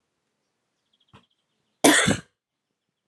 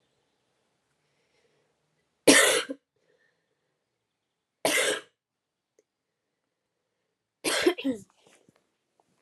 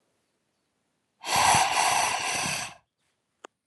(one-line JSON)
{"cough_length": "3.1 s", "cough_amplitude": 27002, "cough_signal_mean_std_ratio": 0.25, "three_cough_length": "9.2 s", "three_cough_amplitude": 24368, "three_cough_signal_mean_std_ratio": 0.25, "exhalation_length": "3.7 s", "exhalation_amplitude": 12786, "exhalation_signal_mean_std_ratio": 0.51, "survey_phase": "alpha (2021-03-01 to 2021-08-12)", "age": "18-44", "gender": "Female", "wearing_mask": "No", "symptom_cough_any": true, "symptom_fatigue": true, "symptom_headache": true, "symptom_change_to_sense_of_smell_or_taste": true, "symptom_loss_of_taste": true, "symptom_onset": "8 days", "smoker_status": "Never smoked", "respiratory_condition_asthma": false, "respiratory_condition_other": false, "recruitment_source": "Test and Trace", "submission_delay": "2 days", "covid_test_result": "Positive", "covid_test_method": "RT-qPCR", "covid_ct_value": 17.5, "covid_ct_gene": "N gene", "covid_ct_mean": 17.5, "covid_viral_load": "1800000 copies/ml", "covid_viral_load_category": "High viral load (>1M copies/ml)"}